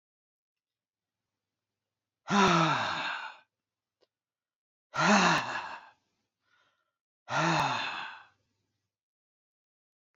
{
  "exhalation_length": "10.2 s",
  "exhalation_amplitude": 10148,
  "exhalation_signal_mean_std_ratio": 0.37,
  "survey_phase": "beta (2021-08-13 to 2022-03-07)",
  "age": "45-64",
  "gender": "Male",
  "wearing_mask": "No",
  "symptom_fatigue": true,
  "symptom_onset": "12 days",
  "smoker_status": "Never smoked",
  "respiratory_condition_asthma": false,
  "respiratory_condition_other": false,
  "recruitment_source": "REACT",
  "submission_delay": "2 days",
  "covid_test_result": "Positive",
  "covid_test_method": "RT-qPCR",
  "covid_ct_value": 32.0,
  "covid_ct_gene": "N gene",
  "influenza_a_test_result": "Negative",
  "influenza_b_test_result": "Negative"
}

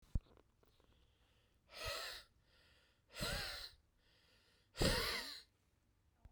{
  "exhalation_length": "6.3 s",
  "exhalation_amplitude": 2505,
  "exhalation_signal_mean_std_ratio": 0.38,
  "survey_phase": "beta (2021-08-13 to 2022-03-07)",
  "age": "18-44",
  "gender": "Male",
  "wearing_mask": "No",
  "symptom_cough_any": true,
  "symptom_sore_throat": true,
  "smoker_status": "Never smoked",
  "respiratory_condition_asthma": true,
  "respiratory_condition_other": false,
  "recruitment_source": "Test and Trace",
  "submission_delay": "1 day",
  "covid_test_result": "Positive",
  "covid_test_method": "RT-qPCR",
  "covid_ct_value": 12.8,
  "covid_ct_gene": "N gene",
  "covid_ct_mean": 14.2,
  "covid_viral_load": "22000000 copies/ml",
  "covid_viral_load_category": "High viral load (>1M copies/ml)"
}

